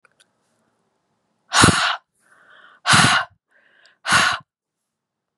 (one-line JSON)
{"exhalation_length": "5.4 s", "exhalation_amplitude": 32768, "exhalation_signal_mean_std_ratio": 0.36, "survey_phase": "beta (2021-08-13 to 2022-03-07)", "age": "45-64", "gender": "Female", "wearing_mask": "No", "symptom_cough_any": true, "symptom_runny_or_blocked_nose": true, "symptom_fatigue": true, "symptom_headache": true, "symptom_onset": "3 days", "smoker_status": "Never smoked", "respiratory_condition_asthma": false, "respiratory_condition_other": false, "recruitment_source": "Test and Trace", "submission_delay": "2 days", "covid_test_result": "Positive", "covid_test_method": "RT-qPCR", "covid_ct_value": 17.7, "covid_ct_gene": "S gene", "covid_ct_mean": 18.3, "covid_viral_load": "1000000 copies/ml", "covid_viral_load_category": "High viral load (>1M copies/ml)"}